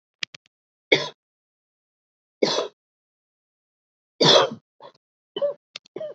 {"three_cough_length": "6.1 s", "three_cough_amplitude": 28353, "three_cough_signal_mean_std_ratio": 0.27, "survey_phase": "beta (2021-08-13 to 2022-03-07)", "age": "18-44", "gender": "Female", "wearing_mask": "No", "symptom_runny_or_blocked_nose": true, "symptom_shortness_of_breath": true, "symptom_sore_throat": true, "symptom_fatigue": true, "symptom_headache": true, "symptom_onset": "6 days", "smoker_status": "Never smoked", "respiratory_condition_asthma": false, "respiratory_condition_other": false, "recruitment_source": "Test and Trace", "submission_delay": "2 days", "covid_test_result": "Positive", "covid_test_method": "RT-qPCR", "covid_ct_value": 15.8, "covid_ct_gene": "ORF1ab gene"}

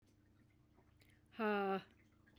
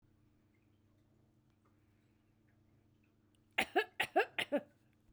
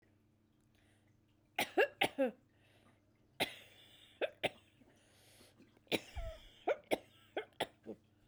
{"exhalation_length": "2.4 s", "exhalation_amplitude": 1062, "exhalation_signal_mean_std_ratio": 0.41, "cough_length": "5.1 s", "cough_amplitude": 4789, "cough_signal_mean_std_ratio": 0.25, "three_cough_length": "8.3 s", "three_cough_amplitude": 5408, "three_cough_signal_mean_std_ratio": 0.31, "survey_phase": "beta (2021-08-13 to 2022-03-07)", "age": "45-64", "gender": "Female", "wearing_mask": "No", "symptom_cough_any": true, "symptom_sore_throat": true, "symptom_fatigue": true, "symptom_headache": true, "smoker_status": "Never smoked", "respiratory_condition_asthma": false, "respiratory_condition_other": true, "recruitment_source": "Test and Trace", "submission_delay": "1 day", "covid_test_result": "Positive", "covid_test_method": "RT-qPCR"}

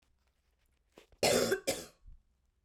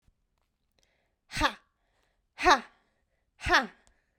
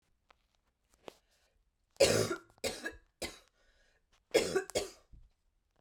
{"cough_length": "2.6 s", "cough_amplitude": 5156, "cough_signal_mean_std_ratio": 0.36, "exhalation_length": "4.2 s", "exhalation_amplitude": 15709, "exhalation_signal_mean_std_ratio": 0.25, "three_cough_length": "5.8 s", "three_cough_amplitude": 7694, "three_cough_signal_mean_std_ratio": 0.31, "survey_phase": "beta (2021-08-13 to 2022-03-07)", "age": "18-44", "gender": "Female", "wearing_mask": "No", "symptom_cough_any": true, "symptom_runny_or_blocked_nose": true, "symptom_sore_throat": true, "symptom_headache": true, "symptom_onset": "3 days", "smoker_status": "Never smoked", "respiratory_condition_asthma": false, "respiratory_condition_other": false, "recruitment_source": "Test and Trace", "submission_delay": "2 days", "covid_test_result": "Positive", "covid_test_method": "RT-qPCR", "covid_ct_value": 26.8, "covid_ct_gene": "N gene"}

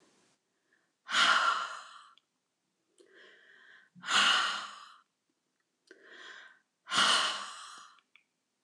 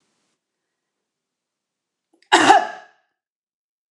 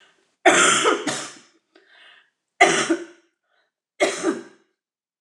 {"exhalation_length": "8.6 s", "exhalation_amplitude": 7353, "exhalation_signal_mean_std_ratio": 0.38, "cough_length": "3.9 s", "cough_amplitude": 29204, "cough_signal_mean_std_ratio": 0.23, "three_cough_length": "5.2 s", "three_cough_amplitude": 29136, "three_cough_signal_mean_std_ratio": 0.4, "survey_phase": "alpha (2021-03-01 to 2021-08-12)", "age": "45-64", "gender": "Female", "wearing_mask": "No", "symptom_none": true, "smoker_status": "Never smoked", "respiratory_condition_asthma": false, "respiratory_condition_other": false, "recruitment_source": "REACT", "submission_delay": "2 days", "covid_test_result": "Negative", "covid_test_method": "RT-qPCR"}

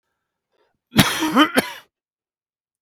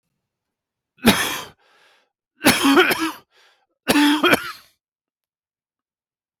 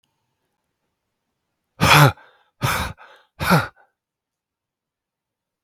{"cough_length": "2.8 s", "cough_amplitude": 32767, "cough_signal_mean_std_ratio": 0.34, "three_cough_length": "6.4 s", "three_cough_amplitude": 32768, "three_cough_signal_mean_std_ratio": 0.38, "exhalation_length": "5.6 s", "exhalation_amplitude": 32767, "exhalation_signal_mean_std_ratio": 0.28, "survey_phase": "beta (2021-08-13 to 2022-03-07)", "age": "45-64", "gender": "Male", "wearing_mask": "No", "symptom_cough_any": true, "symptom_fatigue": true, "symptom_change_to_sense_of_smell_or_taste": true, "symptom_onset": "4 days", "smoker_status": "Never smoked", "respiratory_condition_asthma": false, "respiratory_condition_other": false, "recruitment_source": "Test and Trace", "submission_delay": "2 days", "covid_test_result": "Positive", "covid_test_method": "RT-qPCR", "covid_ct_value": 16.6, "covid_ct_gene": "N gene", "covid_ct_mean": 17.8, "covid_viral_load": "1400000 copies/ml", "covid_viral_load_category": "High viral load (>1M copies/ml)"}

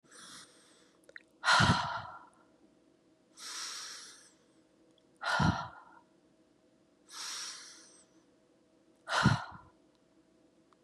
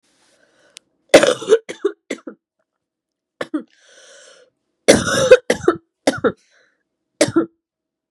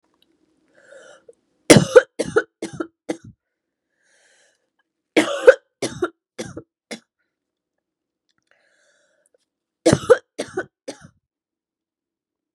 {"exhalation_length": "10.8 s", "exhalation_amplitude": 7612, "exhalation_signal_mean_std_ratio": 0.34, "cough_length": "8.1 s", "cough_amplitude": 32768, "cough_signal_mean_std_ratio": 0.3, "three_cough_length": "12.5 s", "three_cough_amplitude": 32768, "three_cough_signal_mean_std_ratio": 0.2, "survey_phase": "beta (2021-08-13 to 2022-03-07)", "age": "18-44", "gender": "Female", "wearing_mask": "No", "symptom_cough_any": true, "symptom_sore_throat": true, "symptom_fatigue": true, "symptom_onset": "4 days", "smoker_status": "Never smoked", "respiratory_condition_asthma": true, "respiratory_condition_other": false, "recruitment_source": "Test and Trace", "submission_delay": "2 days", "covid_test_result": "Positive", "covid_test_method": "RT-qPCR", "covid_ct_value": 17.0, "covid_ct_gene": "ORF1ab gene"}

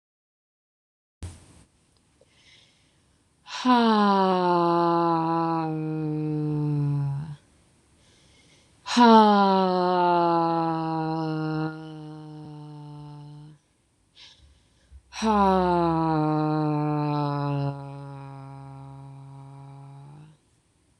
{"exhalation_length": "21.0 s", "exhalation_amplitude": 24278, "exhalation_signal_mean_std_ratio": 0.56, "survey_phase": "beta (2021-08-13 to 2022-03-07)", "age": "18-44", "gender": "Female", "wearing_mask": "No", "symptom_cough_any": true, "symptom_runny_or_blocked_nose": true, "symptom_sore_throat": true, "symptom_fatigue": true, "symptom_headache": true, "symptom_other": true, "smoker_status": "Ex-smoker", "respiratory_condition_asthma": false, "respiratory_condition_other": false, "recruitment_source": "Test and Trace", "submission_delay": "2 days", "covid_test_result": "Positive", "covid_test_method": "RT-qPCR", "covid_ct_value": 32.7, "covid_ct_gene": "ORF1ab gene"}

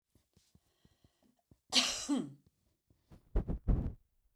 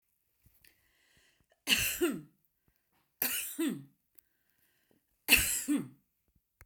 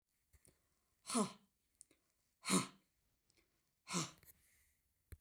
{"cough_length": "4.4 s", "cough_amplitude": 7273, "cough_signal_mean_std_ratio": 0.35, "three_cough_length": "6.7 s", "three_cough_amplitude": 11602, "three_cough_signal_mean_std_ratio": 0.36, "exhalation_length": "5.2 s", "exhalation_amplitude": 2953, "exhalation_signal_mean_std_ratio": 0.27, "survey_phase": "beta (2021-08-13 to 2022-03-07)", "age": "65+", "gender": "Female", "wearing_mask": "No", "symptom_none": true, "smoker_status": "Never smoked", "respiratory_condition_asthma": false, "respiratory_condition_other": false, "recruitment_source": "REACT", "submission_delay": "1 day", "covid_test_result": "Negative", "covid_test_method": "RT-qPCR"}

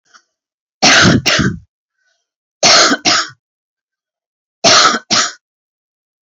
{"three_cough_length": "6.3 s", "three_cough_amplitude": 32768, "three_cough_signal_mean_std_ratio": 0.45, "survey_phase": "beta (2021-08-13 to 2022-03-07)", "age": "45-64", "gender": "Female", "wearing_mask": "No", "symptom_cough_any": true, "symptom_runny_or_blocked_nose": true, "symptom_shortness_of_breath": true, "symptom_sore_throat": true, "smoker_status": "Never smoked", "respiratory_condition_asthma": true, "respiratory_condition_other": false, "recruitment_source": "Test and Trace", "submission_delay": "1 day", "covid_test_result": "Positive", "covid_test_method": "RT-qPCR", "covid_ct_value": 27.3, "covid_ct_gene": "ORF1ab gene"}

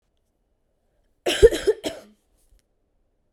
{"cough_length": "3.3 s", "cough_amplitude": 30886, "cough_signal_mean_std_ratio": 0.23, "survey_phase": "beta (2021-08-13 to 2022-03-07)", "age": "18-44", "gender": "Female", "wearing_mask": "No", "symptom_none": true, "symptom_onset": "7 days", "smoker_status": "Current smoker (e-cigarettes or vapes only)", "respiratory_condition_asthma": false, "respiratory_condition_other": false, "recruitment_source": "REACT", "submission_delay": "1 day", "covid_test_result": "Negative", "covid_test_method": "RT-qPCR", "influenza_a_test_result": "Negative", "influenza_b_test_result": "Negative"}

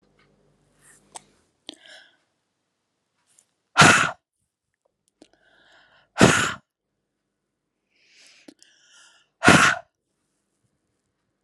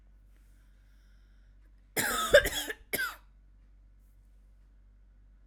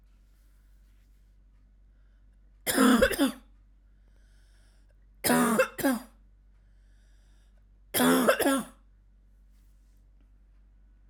{"exhalation_length": "11.4 s", "exhalation_amplitude": 32767, "exhalation_signal_mean_std_ratio": 0.22, "cough_length": "5.5 s", "cough_amplitude": 15446, "cough_signal_mean_std_ratio": 0.29, "three_cough_length": "11.1 s", "three_cough_amplitude": 12453, "three_cough_signal_mean_std_ratio": 0.37, "survey_phase": "alpha (2021-03-01 to 2021-08-12)", "age": "18-44", "gender": "Female", "wearing_mask": "No", "symptom_none": true, "smoker_status": "Ex-smoker", "respiratory_condition_asthma": false, "respiratory_condition_other": false, "recruitment_source": "REACT", "submission_delay": "4 days", "covid_test_result": "Negative", "covid_test_method": "RT-qPCR"}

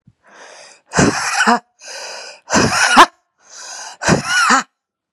{"exhalation_length": "5.1 s", "exhalation_amplitude": 32768, "exhalation_signal_mean_std_ratio": 0.49, "survey_phase": "beta (2021-08-13 to 2022-03-07)", "age": "18-44", "gender": "Female", "wearing_mask": "No", "symptom_cough_any": true, "symptom_runny_or_blocked_nose": true, "symptom_shortness_of_breath": true, "symptom_sore_throat": true, "symptom_abdominal_pain": true, "symptom_diarrhoea": true, "symptom_fatigue": true, "symptom_fever_high_temperature": true, "symptom_headache": true, "symptom_change_to_sense_of_smell_or_taste": true, "symptom_onset": "4 days", "smoker_status": "Ex-smoker", "respiratory_condition_asthma": false, "respiratory_condition_other": false, "recruitment_source": "Test and Trace", "submission_delay": "2 days", "covid_test_result": "Positive", "covid_test_method": "RT-qPCR", "covid_ct_value": 21.4, "covid_ct_gene": "ORF1ab gene", "covid_ct_mean": 21.7, "covid_viral_load": "77000 copies/ml", "covid_viral_load_category": "Low viral load (10K-1M copies/ml)"}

